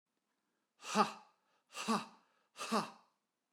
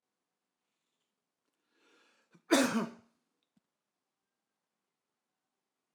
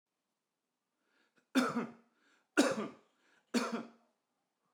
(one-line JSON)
{"exhalation_length": "3.5 s", "exhalation_amplitude": 5202, "exhalation_signal_mean_std_ratio": 0.33, "cough_length": "5.9 s", "cough_amplitude": 7582, "cough_signal_mean_std_ratio": 0.19, "three_cough_length": "4.7 s", "three_cough_amplitude": 6675, "three_cough_signal_mean_std_ratio": 0.32, "survey_phase": "alpha (2021-03-01 to 2021-08-12)", "age": "45-64", "gender": "Male", "wearing_mask": "No", "symptom_none": true, "smoker_status": "Never smoked", "respiratory_condition_asthma": false, "respiratory_condition_other": false, "recruitment_source": "REACT", "submission_delay": "1 day", "covid_test_result": "Negative", "covid_test_method": "RT-qPCR"}